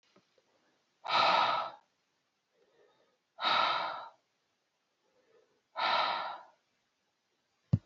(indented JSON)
{
  "exhalation_length": "7.9 s",
  "exhalation_amplitude": 6433,
  "exhalation_signal_mean_std_ratio": 0.39,
  "survey_phase": "beta (2021-08-13 to 2022-03-07)",
  "age": "65+",
  "gender": "Female",
  "wearing_mask": "No",
  "symptom_none": true,
  "smoker_status": "Current smoker (e-cigarettes or vapes only)",
  "respiratory_condition_asthma": false,
  "respiratory_condition_other": false,
  "recruitment_source": "REACT",
  "submission_delay": "2 days",
  "covid_test_result": "Negative",
  "covid_test_method": "RT-qPCR"
}